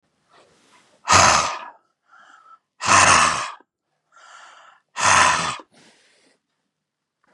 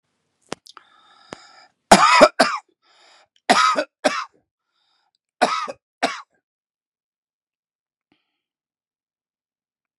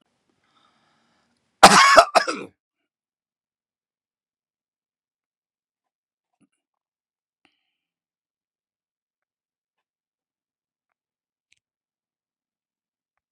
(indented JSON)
{
  "exhalation_length": "7.3 s",
  "exhalation_amplitude": 30079,
  "exhalation_signal_mean_std_ratio": 0.38,
  "three_cough_length": "10.0 s",
  "three_cough_amplitude": 32768,
  "three_cough_signal_mean_std_ratio": 0.26,
  "cough_length": "13.3 s",
  "cough_amplitude": 32768,
  "cough_signal_mean_std_ratio": 0.15,
  "survey_phase": "beta (2021-08-13 to 2022-03-07)",
  "age": "65+",
  "gender": "Male",
  "wearing_mask": "No",
  "symptom_shortness_of_breath": true,
  "smoker_status": "Ex-smoker",
  "respiratory_condition_asthma": false,
  "respiratory_condition_other": false,
  "recruitment_source": "REACT",
  "submission_delay": "10 days",
  "covid_test_result": "Negative",
  "covid_test_method": "RT-qPCR",
  "influenza_a_test_result": "Negative",
  "influenza_b_test_result": "Negative"
}